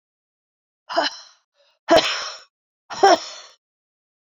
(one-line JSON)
{"exhalation_length": "4.3 s", "exhalation_amplitude": 26264, "exhalation_signal_mean_std_ratio": 0.31, "survey_phase": "beta (2021-08-13 to 2022-03-07)", "age": "45-64", "gender": "Female", "wearing_mask": "No", "symptom_cough_any": true, "symptom_runny_or_blocked_nose": true, "symptom_shortness_of_breath": true, "symptom_sore_throat": true, "symptom_diarrhoea": true, "symptom_fatigue": true, "symptom_fever_high_temperature": true, "symptom_headache": true, "smoker_status": "Never smoked", "respiratory_condition_asthma": true, "respiratory_condition_other": false, "recruitment_source": "Test and Trace", "submission_delay": "2 days", "covid_test_result": "Positive", "covid_test_method": "LFT"}